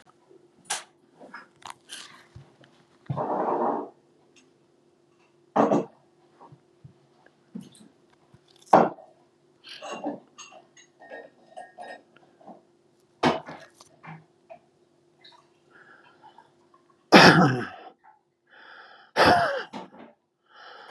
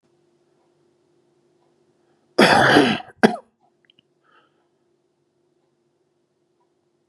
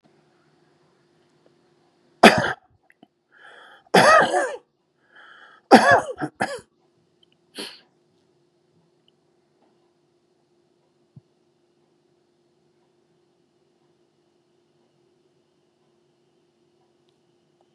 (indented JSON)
{
  "exhalation_length": "20.9 s",
  "exhalation_amplitude": 30992,
  "exhalation_signal_mean_std_ratio": 0.27,
  "cough_length": "7.1 s",
  "cough_amplitude": 32767,
  "cough_signal_mean_std_ratio": 0.25,
  "three_cough_length": "17.7 s",
  "three_cough_amplitude": 32768,
  "three_cough_signal_mean_std_ratio": 0.2,
  "survey_phase": "beta (2021-08-13 to 2022-03-07)",
  "age": "65+",
  "gender": "Male",
  "wearing_mask": "No",
  "symptom_none": true,
  "smoker_status": "Never smoked",
  "respiratory_condition_asthma": false,
  "respiratory_condition_other": false,
  "recruitment_source": "REACT",
  "submission_delay": "4 days",
  "covid_test_result": "Negative",
  "covid_test_method": "RT-qPCR",
  "influenza_a_test_result": "Negative",
  "influenza_b_test_result": "Negative"
}